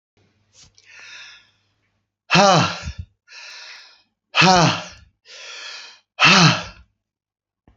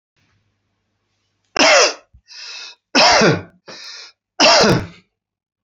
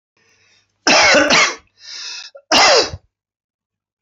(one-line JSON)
{"exhalation_length": "7.8 s", "exhalation_amplitude": 32768, "exhalation_signal_mean_std_ratio": 0.35, "three_cough_length": "5.6 s", "three_cough_amplitude": 31962, "three_cough_signal_mean_std_ratio": 0.41, "cough_length": "4.0 s", "cough_amplitude": 32768, "cough_signal_mean_std_ratio": 0.45, "survey_phase": "beta (2021-08-13 to 2022-03-07)", "age": "65+", "gender": "Male", "wearing_mask": "No", "symptom_cough_any": true, "smoker_status": "Ex-smoker", "respiratory_condition_asthma": false, "respiratory_condition_other": false, "recruitment_source": "REACT", "submission_delay": "2 days", "covid_test_result": "Negative", "covid_test_method": "RT-qPCR", "influenza_a_test_result": "Negative", "influenza_b_test_result": "Negative"}